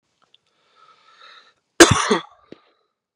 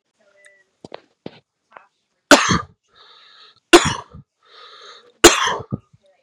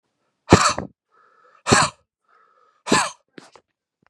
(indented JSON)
{
  "cough_length": "3.2 s",
  "cough_amplitude": 32768,
  "cough_signal_mean_std_ratio": 0.22,
  "three_cough_length": "6.2 s",
  "three_cough_amplitude": 32768,
  "three_cough_signal_mean_std_ratio": 0.25,
  "exhalation_length": "4.1 s",
  "exhalation_amplitude": 32768,
  "exhalation_signal_mean_std_ratio": 0.29,
  "survey_phase": "beta (2021-08-13 to 2022-03-07)",
  "age": "18-44",
  "gender": "Female",
  "wearing_mask": "No",
  "symptom_shortness_of_breath": true,
  "symptom_sore_throat": true,
  "symptom_diarrhoea": true,
  "symptom_fatigue": true,
  "symptom_headache": true,
  "smoker_status": "Ex-smoker",
  "respiratory_condition_asthma": false,
  "respiratory_condition_other": false,
  "recruitment_source": "Test and Trace",
  "submission_delay": "1 day",
  "covid_test_result": "Positive",
  "covid_test_method": "LFT"
}